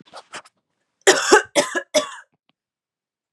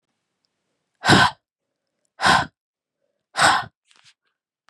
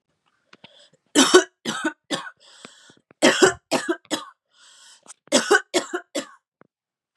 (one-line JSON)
{"cough_length": "3.3 s", "cough_amplitude": 32767, "cough_signal_mean_std_ratio": 0.32, "exhalation_length": "4.7 s", "exhalation_amplitude": 29304, "exhalation_signal_mean_std_ratio": 0.31, "three_cough_length": "7.2 s", "three_cough_amplitude": 32675, "three_cough_signal_mean_std_ratio": 0.34, "survey_phase": "beta (2021-08-13 to 2022-03-07)", "age": "18-44", "gender": "Female", "wearing_mask": "No", "symptom_runny_or_blocked_nose": true, "smoker_status": "Ex-smoker", "respiratory_condition_asthma": true, "respiratory_condition_other": false, "recruitment_source": "REACT", "submission_delay": "2 days", "covid_test_result": "Negative", "covid_test_method": "RT-qPCR", "influenza_a_test_result": "Unknown/Void", "influenza_b_test_result": "Unknown/Void"}